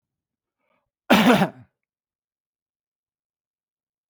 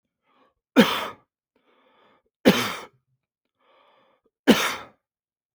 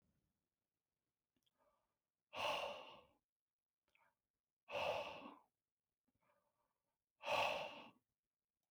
{
  "cough_length": "4.1 s",
  "cough_amplitude": 24028,
  "cough_signal_mean_std_ratio": 0.24,
  "three_cough_length": "5.5 s",
  "three_cough_amplitude": 26523,
  "three_cough_signal_mean_std_ratio": 0.26,
  "exhalation_length": "8.7 s",
  "exhalation_amplitude": 1227,
  "exhalation_signal_mean_std_ratio": 0.34,
  "survey_phase": "beta (2021-08-13 to 2022-03-07)",
  "age": "45-64",
  "gender": "Male",
  "wearing_mask": "No",
  "symptom_runny_or_blocked_nose": true,
  "smoker_status": "Never smoked",
  "respiratory_condition_asthma": false,
  "respiratory_condition_other": false,
  "recruitment_source": "REACT",
  "submission_delay": "1 day",
  "covid_test_result": "Negative",
  "covid_test_method": "RT-qPCR",
  "influenza_a_test_result": "Negative",
  "influenza_b_test_result": "Negative"
}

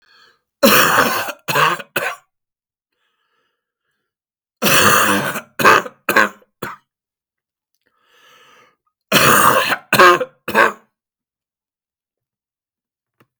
{
  "three_cough_length": "13.4 s",
  "three_cough_amplitude": 32768,
  "three_cough_signal_mean_std_ratio": 0.4,
  "survey_phase": "beta (2021-08-13 to 2022-03-07)",
  "age": "65+",
  "gender": "Male",
  "wearing_mask": "No",
  "symptom_cough_any": true,
  "symptom_runny_or_blocked_nose": true,
  "symptom_onset": "12 days",
  "smoker_status": "Ex-smoker",
  "respiratory_condition_asthma": false,
  "respiratory_condition_other": false,
  "recruitment_source": "REACT",
  "submission_delay": "1 day",
  "covid_test_result": "Negative",
  "covid_test_method": "RT-qPCR",
  "influenza_a_test_result": "Negative",
  "influenza_b_test_result": "Negative"
}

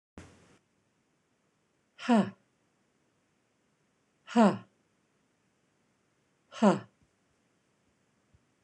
{
  "exhalation_length": "8.6 s",
  "exhalation_amplitude": 10397,
  "exhalation_signal_mean_std_ratio": 0.21,
  "survey_phase": "beta (2021-08-13 to 2022-03-07)",
  "age": "45-64",
  "gender": "Female",
  "wearing_mask": "No",
  "symptom_none": true,
  "smoker_status": "Ex-smoker",
  "respiratory_condition_asthma": false,
  "respiratory_condition_other": false,
  "recruitment_source": "REACT",
  "submission_delay": "1 day",
  "covid_test_result": "Negative",
  "covid_test_method": "RT-qPCR",
  "influenza_a_test_result": "Negative",
  "influenza_b_test_result": "Negative"
}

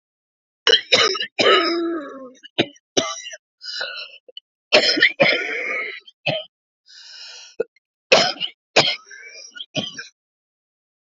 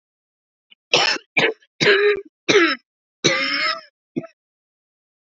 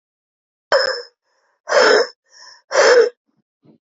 {
  "three_cough_length": "11.0 s",
  "three_cough_amplitude": 31784,
  "three_cough_signal_mean_std_ratio": 0.43,
  "cough_length": "5.2 s",
  "cough_amplitude": 28110,
  "cough_signal_mean_std_ratio": 0.45,
  "exhalation_length": "3.9 s",
  "exhalation_amplitude": 28873,
  "exhalation_signal_mean_std_ratio": 0.42,
  "survey_phase": "beta (2021-08-13 to 2022-03-07)",
  "age": "45-64",
  "gender": "Female",
  "wearing_mask": "No",
  "symptom_cough_any": true,
  "symptom_runny_or_blocked_nose": true,
  "symptom_shortness_of_breath": true,
  "symptom_fatigue": true,
  "symptom_fever_high_temperature": true,
  "symptom_headache": true,
  "symptom_change_to_sense_of_smell_or_taste": true,
  "symptom_onset": "3 days",
  "smoker_status": "Never smoked",
  "respiratory_condition_asthma": true,
  "respiratory_condition_other": false,
  "recruitment_source": "Test and Trace",
  "submission_delay": "2 days",
  "covid_test_result": "Positive",
  "covid_test_method": "RT-qPCR",
  "covid_ct_value": 18.0,
  "covid_ct_gene": "N gene"
}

